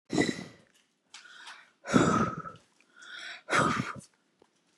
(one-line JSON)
{"exhalation_length": "4.8 s", "exhalation_amplitude": 12206, "exhalation_signal_mean_std_ratio": 0.42, "survey_phase": "beta (2021-08-13 to 2022-03-07)", "age": "45-64", "gender": "Female", "wearing_mask": "No", "symptom_none": true, "smoker_status": "Ex-smoker", "respiratory_condition_asthma": false, "respiratory_condition_other": false, "recruitment_source": "REACT", "submission_delay": "3 days", "covid_test_result": "Negative", "covid_test_method": "RT-qPCR", "influenza_a_test_result": "Negative", "influenza_b_test_result": "Negative"}